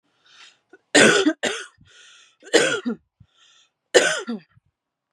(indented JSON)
{
  "three_cough_length": "5.1 s",
  "three_cough_amplitude": 32193,
  "three_cough_signal_mean_std_ratio": 0.36,
  "survey_phase": "beta (2021-08-13 to 2022-03-07)",
  "age": "18-44",
  "gender": "Female",
  "wearing_mask": "No",
  "symptom_cough_any": true,
  "symptom_runny_or_blocked_nose": true,
  "symptom_fatigue": true,
  "symptom_headache": true,
  "symptom_change_to_sense_of_smell_or_taste": true,
  "symptom_loss_of_taste": true,
  "symptom_onset": "3 days",
  "smoker_status": "Never smoked",
  "respiratory_condition_asthma": false,
  "respiratory_condition_other": false,
  "recruitment_source": "Test and Trace",
  "submission_delay": "2 days",
  "covid_test_result": "Positive",
  "covid_test_method": "RT-qPCR",
  "covid_ct_value": 15.4,
  "covid_ct_gene": "ORF1ab gene",
  "covid_ct_mean": 15.8,
  "covid_viral_load": "6400000 copies/ml",
  "covid_viral_load_category": "High viral load (>1M copies/ml)"
}